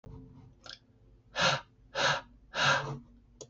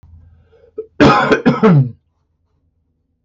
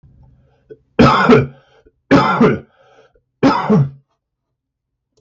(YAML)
exhalation_length: 3.5 s
exhalation_amplitude: 7288
exhalation_signal_mean_std_ratio: 0.46
cough_length: 3.2 s
cough_amplitude: 32768
cough_signal_mean_std_ratio: 0.43
three_cough_length: 5.2 s
three_cough_amplitude: 32768
three_cough_signal_mean_std_ratio: 0.43
survey_phase: beta (2021-08-13 to 2022-03-07)
age: 45-64
gender: Male
wearing_mask: 'No'
symptom_none: true
smoker_status: Never smoked
respiratory_condition_asthma: false
respiratory_condition_other: false
recruitment_source: REACT
submission_delay: 1 day
covid_test_result: Negative
covid_test_method: RT-qPCR